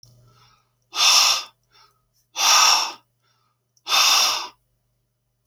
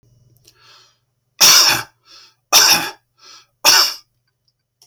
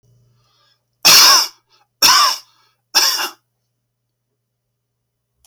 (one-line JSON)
{"exhalation_length": "5.5 s", "exhalation_amplitude": 25246, "exhalation_signal_mean_std_ratio": 0.44, "three_cough_length": "4.9 s", "three_cough_amplitude": 30824, "three_cough_signal_mean_std_ratio": 0.38, "cough_length": "5.5 s", "cough_amplitude": 32767, "cough_signal_mean_std_ratio": 0.36, "survey_phase": "beta (2021-08-13 to 2022-03-07)", "age": "65+", "gender": "Male", "wearing_mask": "No", "symptom_runny_or_blocked_nose": true, "symptom_sore_throat": true, "symptom_onset": "12 days", "smoker_status": "Never smoked", "respiratory_condition_asthma": true, "respiratory_condition_other": false, "recruitment_source": "REACT", "submission_delay": "0 days", "covid_test_result": "Negative", "covid_test_method": "RT-qPCR"}